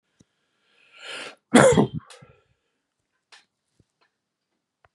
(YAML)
cough_length: 4.9 s
cough_amplitude: 32115
cough_signal_mean_std_ratio: 0.23
survey_phase: beta (2021-08-13 to 2022-03-07)
age: 65+
gender: Male
wearing_mask: 'No'
symptom_none: true
smoker_status: Ex-smoker
respiratory_condition_asthma: false
respiratory_condition_other: false
recruitment_source: REACT
submission_delay: 1 day
covid_test_result: Negative
covid_test_method: RT-qPCR
influenza_a_test_result: Negative
influenza_b_test_result: Negative